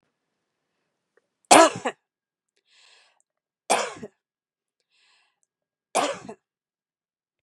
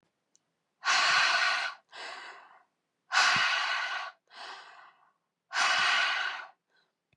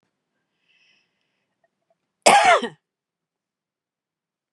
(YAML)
three_cough_length: 7.4 s
three_cough_amplitude: 32767
three_cough_signal_mean_std_ratio: 0.2
exhalation_length: 7.2 s
exhalation_amplitude: 7818
exhalation_signal_mean_std_ratio: 0.55
cough_length: 4.5 s
cough_amplitude: 32767
cough_signal_mean_std_ratio: 0.23
survey_phase: beta (2021-08-13 to 2022-03-07)
age: 45-64
gender: Female
wearing_mask: 'No'
symptom_none: true
symptom_onset: 6 days
smoker_status: Ex-smoker
respiratory_condition_asthma: false
respiratory_condition_other: false
recruitment_source: Test and Trace
submission_delay: 3 days
covid_test_result: Negative
covid_test_method: ePCR